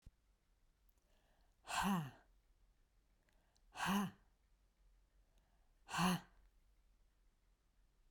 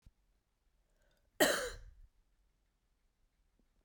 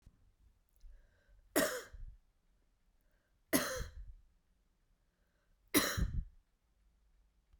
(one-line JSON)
{"exhalation_length": "8.1 s", "exhalation_amplitude": 1783, "exhalation_signal_mean_std_ratio": 0.32, "cough_length": "3.8 s", "cough_amplitude": 6036, "cough_signal_mean_std_ratio": 0.23, "three_cough_length": "7.6 s", "three_cough_amplitude": 5693, "three_cough_signal_mean_std_ratio": 0.32, "survey_phase": "beta (2021-08-13 to 2022-03-07)", "age": "45-64", "gender": "Female", "wearing_mask": "No", "symptom_runny_or_blocked_nose": true, "symptom_sore_throat": true, "symptom_fatigue": true, "symptom_headache": true, "symptom_change_to_sense_of_smell_or_taste": true, "symptom_loss_of_taste": true, "smoker_status": "Ex-smoker", "respiratory_condition_asthma": false, "respiratory_condition_other": false, "recruitment_source": "Test and Trace", "submission_delay": "2 days", "covid_test_result": "Positive", "covid_test_method": "LFT"}